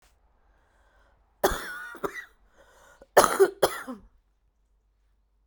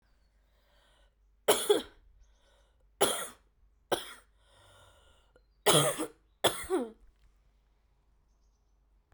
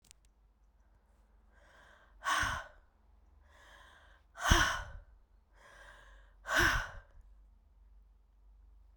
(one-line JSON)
{"cough_length": "5.5 s", "cough_amplitude": 26331, "cough_signal_mean_std_ratio": 0.27, "three_cough_length": "9.1 s", "three_cough_amplitude": 11131, "three_cough_signal_mean_std_ratio": 0.3, "exhalation_length": "9.0 s", "exhalation_amplitude": 9917, "exhalation_signal_mean_std_ratio": 0.33, "survey_phase": "beta (2021-08-13 to 2022-03-07)", "age": "45-64", "gender": "Female", "wearing_mask": "No", "symptom_cough_any": true, "symptom_runny_or_blocked_nose": true, "symptom_sore_throat": true, "symptom_fatigue": true, "symptom_fever_high_temperature": true, "symptom_headache": true, "symptom_onset": "3 days", "smoker_status": "Never smoked", "respiratory_condition_asthma": true, "respiratory_condition_other": false, "recruitment_source": "Test and Trace", "submission_delay": "2 days", "covid_test_result": "Positive", "covid_test_method": "RT-qPCR", "covid_ct_value": 14.8, "covid_ct_gene": "ORF1ab gene", "covid_ct_mean": 15.7, "covid_viral_load": "7300000 copies/ml", "covid_viral_load_category": "High viral load (>1M copies/ml)"}